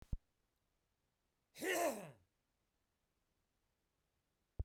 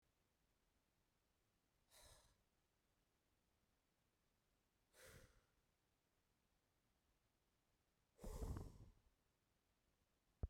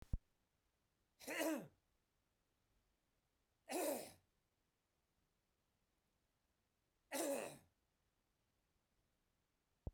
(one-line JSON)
{"cough_length": "4.6 s", "cough_amplitude": 1403, "cough_signal_mean_std_ratio": 0.27, "exhalation_length": "10.5 s", "exhalation_amplitude": 502, "exhalation_signal_mean_std_ratio": 0.25, "three_cough_length": "9.9 s", "three_cough_amplitude": 1379, "three_cough_signal_mean_std_ratio": 0.29, "survey_phase": "beta (2021-08-13 to 2022-03-07)", "age": "45-64", "gender": "Male", "wearing_mask": "No", "symptom_change_to_sense_of_smell_or_taste": true, "smoker_status": "Never smoked", "respiratory_condition_asthma": false, "respiratory_condition_other": false, "recruitment_source": "REACT", "submission_delay": "1 day", "covid_test_result": "Negative", "covid_test_method": "RT-qPCR", "influenza_a_test_result": "Negative", "influenza_b_test_result": "Negative"}